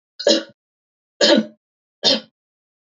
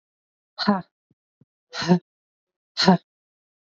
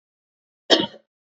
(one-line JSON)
{"three_cough_length": "2.8 s", "three_cough_amplitude": 27673, "three_cough_signal_mean_std_ratio": 0.35, "exhalation_length": "3.7 s", "exhalation_amplitude": 26508, "exhalation_signal_mean_std_ratio": 0.29, "cough_length": "1.4 s", "cough_amplitude": 29574, "cough_signal_mean_std_ratio": 0.24, "survey_phase": "beta (2021-08-13 to 2022-03-07)", "age": "18-44", "gender": "Female", "wearing_mask": "No", "symptom_cough_any": true, "symptom_runny_or_blocked_nose": true, "symptom_fever_high_temperature": true, "symptom_headache": true, "smoker_status": "Never smoked", "respiratory_condition_asthma": false, "respiratory_condition_other": false, "recruitment_source": "Test and Trace", "submission_delay": "1 day", "covid_test_result": "Positive", "covid_test_method": "LFT"}